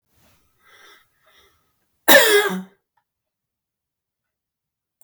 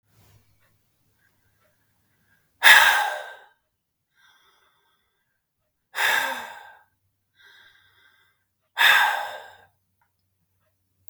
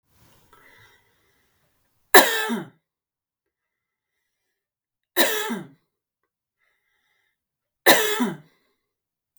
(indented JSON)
{
  "cough_length": "5.0 s",
  "cough_amplitude": 32768,
  "cough_signal_mean_std_ratio": 0.24,
  "exhalation_length": "11.1 s",
  "exhalation_amplitude": 32768,
  "exhalation_signal_mean_std_ratio": 0.27,
  "three_cough_length": "9.4 s",
  "three_cough_amplitude": 32768,
  "three_cough_signal_mean_std_ratio": 0.24,
  "survey_phase": "beta (2021-08-13 to 2022-03-07)",
  "age": "45-64",
  "gender": "Female",
  "wearing_mask": "No",
  "symptom_none": true,
  "smoker_status": "Never smoked",
  "respiratory_condition_asthma": true,
  "respiratory_condition_other": false,
  "recruitment_source": "REACT",
  "submission_delay": "2 days",
  "covid_test_result": "Negative",
  "covid_test_method": "RT-qPCR",
  "influenza_a_test_result": "Negative",
  "influenza_b_test_result": "Negative"
}